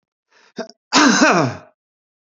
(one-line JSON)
{"cough_length": "2.4 s", "cough_amplitude": 28939, "cough_signal_mean_std_ratio": 0.42, "survey_phase": "alpha (2021-03-01 to 2021-08-12)", "age": "65+", "gender": "Male", "wearing_mask": "No", "symptom_none": true, "smoker_status": "Ex-smoker", "respiratory_condition_asthma": false, "respiratory_condition_other": false, "recruitment_source": "REACT", "submission_delay": "2 days", "covid_test_result": "Negative", "covid_test_method": "RT-qPCR"}